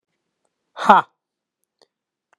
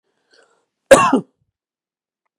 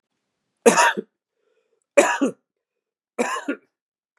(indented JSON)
{
  "exhalation_length": "2.4 s",
  "exhalation_amplitude": 32768,
  "exhalation_signal_mean_std_ratio": 0.2,
  "cough_length": "2.4 s",
  "cough_amplitude": 32768,
  "cough_signal_mean_std_ratio": 0.25,
  "three_cough_length": "4.2 s",
  "three_cough_amplitude": 31222,
  "three_cough_signal_mean_std_ratio": 0.32,
  "survey_phase": "beta (2021-08-13 to 2022-03-07)",
  "age": "45-64",
  "gender": "Male",
  "wearing_mask": "No",
  "symptom_none": true,
  "smoker_status": "Never smoked",
  "respiratory_condition_asthma": false,
  "respiratory_condition_other": false,
  "recruitment_source": "REACT",
  "submission_delay": "2 days",
  "covid_test_result": "Negative",
  "covid_test_method": "RT-qPCR",
  "influenza_a_test_result": "Negative",
  "influenza_b_test_result": "Negative"
}